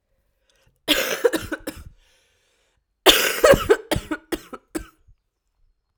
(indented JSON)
{
  "cough_length": "6.0 s",
  "cough_amplitude": 32768,
  "cough_signal_mean_std_ratio": 0.34,
  "survey_phase": "alpha (2021-03-01 to 2021-08-12)",
  "age": "18-44",
  "gender": "Female",
  "wearing_mask": "No",
  "symptom_cough_any": true,
  "symptom_new_continuous_cough": true,
  "symptom_shortness_of_breath": true,
  "symptom_fatigue": true,
  "symptom_fever_high_temperature": true,
  "symptom_headache": true,
  "symptom_change_to_sense_of_smell_or_taste": true,
  "symptom_loss_of_taste": true,
  "symptom_onset": "4 days",
  "smoker_status": "Ex-smoker",
  "respiratory_condition_asthma": false,
  "respiratory_condition_other": false,
  "recruitment_source": "Test and Trace",
  "submission_delay": "2 days",
  "covid_test_result": "Positive",
  "covid_test_method": "RT-qPCR",
  "covid_ct_value": 15.4,
  "covid_ct_gene": "ORF1ab gene",
  "covid_ct_mean": 15.7,
  "covid_viral_load": "6900000 copies/ml",
  "covid_viral_load_category": "High viral load (>1M copies/ml)"
}